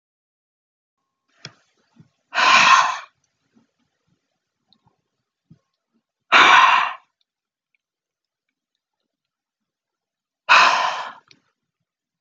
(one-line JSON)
{"exhalation_length": "12.2 s", "exhalation_amplitude": 31602, "exhalation_signal_mean_std_ratio": 0.29, "survey_phase": "beta (2021-08-13 to 2022-03-07)", "age": "65+", "gender": "Female", "wearing_mask": "No", "symptom_none": true, "smoker_status": "Never smoked", "respiratory_condition_asthma": false, "respiratory_condition_other": false, "recruitment_source": "REACT", "submission_delay": "2 days", "covid_test_result": "Negative", "covid_test_method": "RT-qPCR"}